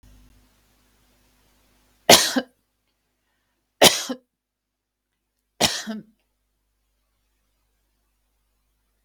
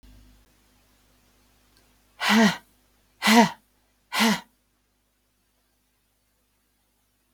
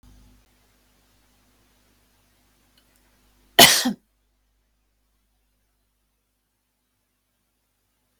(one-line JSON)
{"three_cough_length": "9.0 s", "three_cough_amplitude": 32767, "three_cough_signal_mean_std_ratio": 0.19, "exhalation_length": "7.3 s", "exhalation_amplitude": 20097, "exhalation_signal_mean_std_ratio": 0.27, "cough_length": "8.2 s", "cough_amplitude": 32768, "cough_signal_mean_std_ratio": 0.14, "survey_phase": "beta (2021-08-13 to 2022-03-07)", "age": "45-64", "gender": "Female", "wearing_mask": "No", "symptom_none": true, "smoker_status": "Never smoked", "respiratory_condition_asthma": false, "respiratory_condition_other": false, "recruitment_source": "REACT", "submission_delay": "1 day", "covid_test_result": "Negative", "covid_test_method": "RT-qPCR"}